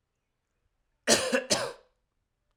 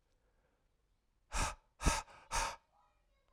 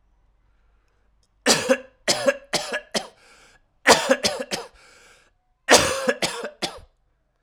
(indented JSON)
{
  "cough_length": "2.6 s",
  "cough_amplitude": 15851,
  "cough_signal_mean_std_ratio": 0.34,
  "exhalation_length": "3.3 s",
  "exhalation_amplitude": 4637,
  "exhalation_signal_mean_std_ratio": 0.34,
  "three_cough_length": "7.4 s",
  "three_cough_amplitude": 32767,
  "three_cough_signal_mean_std_ratio": 0.37,
  "survey_phase": "alpha (2021-03-01 to 2021-08-12)",
  "age": "18-44",
  "gender": "Male",
  "wearing_mask": "No",
  "symptom_cough_any": true,
  "symptom_shortness_of_breath": true,
  "symptom_fatigue": true,
  "symptom_fever_high_temperature": true,
  "symptom_headache": true,
  "smoker_status": "Never smoked",
  "respiratory_condition_asthma": false,
  "respiratory_condition_other": false,
  "recruitment_source": "Test and Trace",
  "submission_delay": "2 days",
  "covid_test_result": "Positive",
  "covid_test_method": "RT-qPCR",
  "covid_ct_value": 25.0,
  "covid_ct_gene": "ORF1ab gene",
  "covid_ct_mean": 25.9,
  "covid_viral_load": "3100 copies/ml",
  "covid_viral_load_category": "Minimal viral load (< 10K copies/ml)"
}